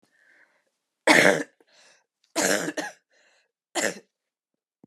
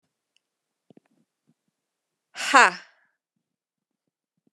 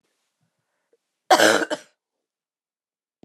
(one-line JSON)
{"three_cough_length": "4.9 s", "three_cough_amplitude": 26891, "three_cough_signal_mean_std_ratio": 0.31, "exhalation_length": "4.5 s", "exhalation_amplitude": 30757, "exhalation_signal_mean_std_ratio": 0.16, "cough_length": "3.2 s", "cough_amplitude": 29392, "cough_signal_mean_std_ratio": 0.25, "survey_phase": "beta (2021-08-13 to 2022-03-07)", "age": "18-44", "gender": "Female", "wearing_mask": "No", "symptom_cough_any": true, "symptom_runny_or_blocked_nose": true, "symptom_fatigue": true, "symptom_headache": true, "smoker_status": "Ex-smoker", "respiratory_condition_asthma": false, "respiratory_condition_other": false, "recruitment_source": "Test and Trace", "submission_delay": "2 days", "covid_test_result": "Positive", "covid_test_method": "RT-qPCR", "covid_ct_value": 19.0, "covid_ct_gene": "ORF1ab gene"}